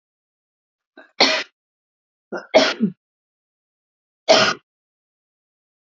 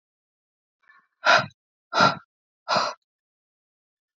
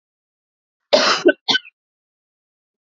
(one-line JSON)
{"three_cough_length": "6.0 s", "three_cough_amplitude": 30449, "three_cough_signal_mean_std_ratio": 0.27, "exhalation_length": "4.2 s", "exhalation_amplitude": 22824, "exhalation_signal_mean_std_ratio": 0.29, "cough_length": "2.8 s", "cough_amplitude": 30441, "cough_signal_mean_std_ratio": 0.31, "survey_phase": "beta (2021-08-13 to 2022-03-07)", "age": "18-44", "gender": "Female", "wearing_mask": "No", "symptom_none": true, "smoker_status": "Never smoked", "respiratory_condition_asthma": false, "respiratory_condition_other": false, "recruitment_source": "REACT", "submission_delay": "1 day", "covid_test_result": "Negative", "covid_test_method": "RT-qPCR", "influenza_a_test_result": "Negative", "influenza_b_test_result": "Negative"}